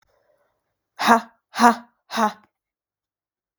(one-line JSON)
{"exhalation_length": "3.6 s", "exhalation_amplitude": 32766, "exhalation_signal_mean_std_ratio": 0.28, "survey_phase": "beta (2021-08-13 to 2022-03-07)", "age": "18-44", "gender": "Female", "wearing_mask": "No", "symptom_cough_any": true, "symptom_runny_or_blocked_nose": true, "symptom_sore_throat": true, "symptom_fatigue": true, "symptom_onset": "7 days", "smoker_status": "Never smoked", "respiratory_condition_asthma": false, "respiratory_condition_other": false, "recruitment_source": "Test and Trace", "submission_delay": "2 days", "covid_test_result": "Positive", "covid_test_method": "RT-qPCR", "covid_ct_value": 18.1, "covid_ct_gene": "N gene"}